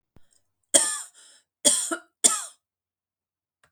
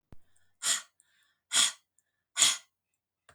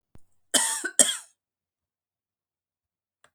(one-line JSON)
{"three_cough_length": "3.7 s", "three_cough_amplitude": 30995, "three_cough_signal_mean_std_ratio": 0.3, "exhalation_length": "3.3 s", "exhalation_amplitude": 13640, "exhalation_signal_mean_std_ratio": 0.31, "cough_length": "3.3 s", "cough_amplitude": 32475, "cough_signal_mean_std_ratio": 0.25, "survey_phase": "beta (2021-08-13 to 2022-03-07)", "age": "45-64", "gender": "Female", "wearing_mask": "No", "symptom_sore_throat": true, "symptom_onset": "7 days", "smoker_status": "Ex-smoker", "respiratory_condition_asthma": false, "respiratory_condition_other": false, "recruitment_source": "REACT", "submission_delay": "7 days", "covid_test_result": "Negative", "covid_test_method": "RT-qPCR"}